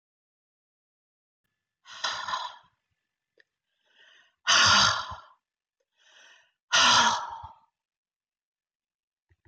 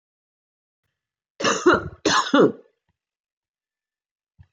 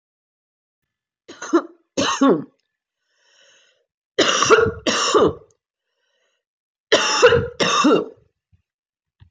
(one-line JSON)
{"exhalation_length": "9.5 s", "exhalation_amplitude": 13270, "exhalation_signal_mean_std_ratio": 0.31, "cough_length": "4.5 s", "cough_amplitude": 19184, "cough_signal_mean_std_ratio": 0.32, "three_cough_length": "9.3 s", "three_cough_amplitude": 25903, "three_cough_signal_mean_std_ratio": 0.42, "survey_phase": "beta (2021-08-13 to 2022-03-07)", "age": "45-64", "gender": "Female", "wearing_mask": "No", "symptom_cough_any": true, "symptom_runny_or_blocked_nose": true, "symptom_shortness_of_breath": true, "symptom_fatigue": true, "symptom_other": true, "smoker_status": "Never smoked", "respiratory_condition_asthma": false, "respiratory_condition_other": false, "recruitment_source": "Test and Trace", "submission_delay": "2 days", "covid_test_result": "Positive", "covid_test_method": "RT-qPCR", "covid_ct_value": 27.8, "covid_ct_gene": "N gene"}